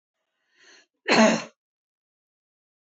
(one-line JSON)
{"cough_length": "2.9 s", "cough_amplitude": 19267, "cough_signal_mean_std_ratio": 0.26, "survey_phase": "beta (2021-08-13 to 2022-03-07)", "age": "45-64", "gender": "Female", "wearing_mask": "No", "symptom_none": true, "smoker_status": "Never smoked", "respiratory_condition_asthma": false, "respiratory_condition_other": false, "recruitment_source": "REACT", "submission_delay": "4 days", "covid_test_result": "Negative", "covid_test_method": "RT-qPCR", "influenza_a_test_result": "Negative", "influenza_b_test_result": "Negative"}